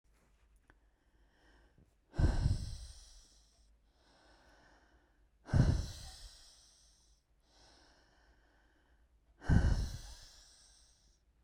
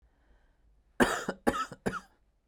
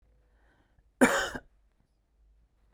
exhalation_length: 11.4 s
exhalation_amplitude: 6703
exhalation_signal_mean_std_ratio: 0.3
three_cough_length: 2.5 s
three_cough_amplitude: 12705
three_cough_signal_mean_std_ratio: 0.35
cough_length: 2.7 s
cough_amplitude: 14317
cough_signal_mean_std_ratio: 0.24
survey_phase: beta (2021-08-13 to 2022-03-07)
age: 18-44
gender: Male
wearing_mask: 'No'
symptom_cough_any: true
symptom_runny_or_blocked_nose: true
symptom_fatigue: true
symptom_fever_high_temperature: true
symptom_headache: true
symptom_change_to_sense_of_smell_or_taste: true
symptom_onset: 6 days
smoker_status: Never smoked
respiratory_condition_asthma: false
respiratory_condition_other: false
recruitment_source: Test and Trace
submission_delay: 2 days
covid_test_result: Positive
covid_test_method: RT-qPCR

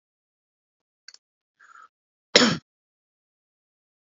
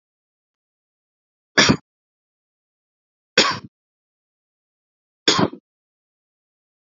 cough_length: 4.2 s
cough_amplitude: 28711
cough_signal_mean_std_ratio: 0.16
three_cough_length: 6.9 s
three_cough_amplitude: 32767
three_cough_signal_mean_std_ratio: 0.21
survey_phase: beta (2021-08-13 to 2022-03-07)
age: 18-44
gender: Male
wearing_mask: 'No'
symptom_none: true
smoker_status: Never smoked
respiratory_condition_asthma: false
respiratory_condition_other: false
recruitment_source: REACT
submission_delay: 2 days
covid_test_result: Negative
covid_test_method: RT-qPCR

